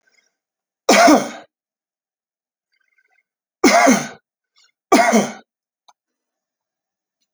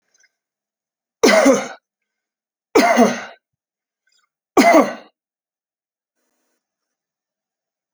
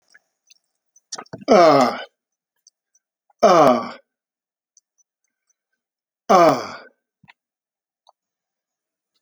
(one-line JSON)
{"cough_length": "7.3 s", "cough_amplitude": 31104, "cough_signal_mean_std_ratio": 0.32, "three_cough_length": "7.9 s", "three_cough_amplitude": 31413, "three_cough_signal_mean_std_ratio": 0.31, "exhalation_length": "9.2 s", "exhalation_amplitude": 28677, "exhalation_signal_mean_std_ratio": 0.29, "survey_phase": "alpha (2021-03-01 to 2021-08-12)", "age": "65+", "gender": "Male", "wearing_mask": "No", "symptom_none": true, "smoker_status": "Ex-smoker", "respiratory_condition_asthma": false, "respiratory_condition_other": false, "recruitment_source": "REACT", "submission_delay": "1 day", "covid_test_result": "Negative", "covid_test_method": "RT-qPCR"}